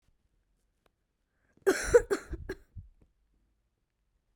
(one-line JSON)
{"three_cough_length": "4.4 s", "three_cough_amplitude": 10576, "three_cough_signal_mean_std_ratio": 0.23, "survey_phase": "beta (2021-08-13 to 2022-03-07)", "age": "18-44", "gender": "Female", "wearing_mask": "No", "symptom_cough_any": true, "symptom_new_continuous_cough": true, "symptom_runny_or_blocked_nose": true, "symptom_shortness_of_breath": true, "symptom_sore_throat": true, "symptom_fatigue": true, "symptom_headache": true, "symptom_other": true, "symptom_onset": "5 days", "smoker_status": "Never smoked", "respiratory_condition_asthma": false, "respiratory_condition_other": false, "recruitment_source": "Test and Trace", "submission_delay": "2 days", "covid_test_result": "Positive", "covid_test_method": "RT-qPCR", "covid_ct_value": 28.9, "covid_ct_gene": "N gene", "covid_ct_mean": 29.2, "covid_viral_load": "270 copies/ml", "covid_viral_load_category": "Minimal viral load (< 10K copies/ml)"}